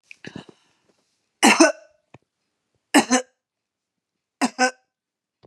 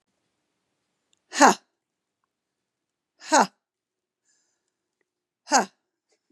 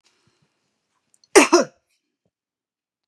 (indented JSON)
{
  "three_cough_length": "5.5 s",
  "three_cough_amplitude": 29689,
  "three_cough_signal_mean_std_ratio": 0.26,
  "exhalation_length": "6.3 s",
  "exhalation_amplitude": 31993,
  "exhalation_signal_mean_std_ratio": 0.19,
  "cough_length": "3.1 s",
  "cough_amplitude": 32768,
  "cough_signal_mean_std_ratio": 0.2,
  "survey_phase": "beta (2021-08-13 to 2022-03-07)",
  "age": "45-64",
  "gender": "Female",
  "wearing_mask": "No",
  "symptom_cough_any": true,
  "symptom_runny_or_blocked_nose": true,
  "smoker_status": "Ex-smoker",
  "respiratory_condition_asthma": false,
  "respiratory_condition_other": false,
  "recruitment_source": "REACT",
  "submission_delay": "3 days",
  "covid_test_result": "Negative",
  "covid_test_method": "RT-qPCR",
  "influenza_a_test_result": "Negative",
  "influenza_b_test_result": "Negative"
}